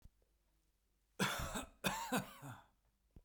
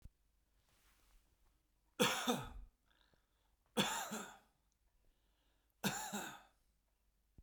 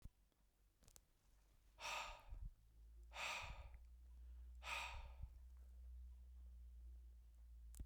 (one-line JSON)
{"cough_length": "3.2 s", "cough_amplitude": 2508, "cough_signal_mean_std_ratio": 0.44, "three_cough_length": "7.4 s", "three_cough_amplitude": 4024, "three_cough_signal_mean_std_ratio": 0.34, "exhalation_length": "7.9 s", "exhalation_amplitude": 642, "exhalation_signal_mean_std_ratio": 0.81, "survey_phase": "beta (2021-08-13 to 2022-03-07)", "age": "45-64", "gender": "Male", "wearing_mask": "No", "symptom_none": true, "smoker_status": "Ex-smoker", "respiratory_condition_asthma": false, "respiratory_condition_other": false, "recruitment_source": "REACT", "submission_delay": "1 day", "covid_test_result": "Negative", "covid_test_method": "RT-qPCR"}